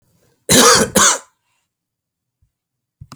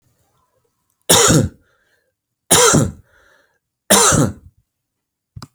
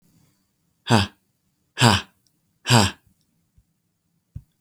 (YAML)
cough_length: 3.2 s
cough_amplitude: 32768
cough_signal_mean_std_ratio: 0.36
three_cough_length: 5.5 s
three_cough_amplitude: 32768
three_cough_signal_mean_std_ratio: 0.39
exhalation_length: 4.6 s
exhalation_amplitude: 30905
exhalation_signal_mean_std_ratio: 0.28
survey_phase: beta (2021-08-13 to 2022-03-07)
age: 45-64
gender: Male
wearing_mask: 'No'
symptom_none: true
smoker_status: Never smoked
respiratory_condition_asthma: false
respiratory_condition_other: false
recruitment_source: REACT
submission_delay: 3 days
covid_test_result: Negative
covid_test_method: RT-qPCR